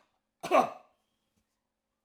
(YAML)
cough_length: 2.0 s
cough_amplitude: 8871
cough_signal_mean_std_ratio: 0.24
survey_phase: alpha (2021-03-01 to 2021-08-12)
age: 65+
gender: Male
wearing_mask: 'No'
symptom_none: true
smoker_status: Ex-smoker
respiratory_condition_asthma: false
respiratory_condition_other: false
recruitment_source: REACT
submission_delay: 6 days
covid_test_result: Negative
covid_test_method: RT-qPCR